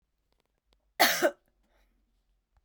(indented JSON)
{
  "cough_length": "2.6 s",
  "cough_amplitude": 13030,
  "cough_signal_mean_std_ratio": 0.25,
  "survey_phase": "beta (2021-08-13 to 2022-03-07)",
  "age": "45-64",
  "gender": "Female",
  "wearing_mask": "No",
  "symptom_cough_any": true,
  "symptom_runny_or_blocked_nose": true,
  "symptom_sore_throat": true,
  "symptom_fatigue": true,
  "symptom_fever_high_temperature": true,
  "symptom_headache": true,
  "smoker_status": "Never smoked",
  "respiratory_condition_asthma": false,
  "respiratory_condition_other": false,
  "recruitment_source": "Test and Trace",
  "submission_delay": "1 day",
  "covid_test_result": "Positive",
  "covid_test_method": "RT-qPCR",
  "covid_ct_value": 23.6,
  "covid_ct_gene": "ORF1ab gene",
  "covid_ct_mean": 24.0,
  "covid_viral_load": "14000 copies/ml",
  "covid_viral_load_category": "Low viral load (10K-1M copies/ml)"
}